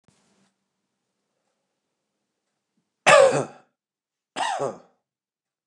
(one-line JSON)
{"cough_length": "5.7 s", "cough_amplitude": 28971, "cough_signal_mean_std_ratio": 0.24, "survey_phase": "beta (2021-08-13 to 2022-03-07)", "age": "45-64", "gender": "Male", "wearing_mask": "No", "symptom_runny_or_blocked_nose": true, "symptom_shortness_of_breath": true, "symptom_abdominal_pain": true, "symptom_diarrhoea": true, "symptom_fatigue": true, "symptom_fever_high_temperature": true, "symptom_headache": true, "symptom_onset": "2 days", "smoker_status": "Never smoked", "respiratory_condition_asthma": true, "respiratory_condition_other": false, "recruitment_source": "Test and Trace", "submission_delay": "1 day", "covid_test_result": "Positive", "covid_test_method": "ePCR"}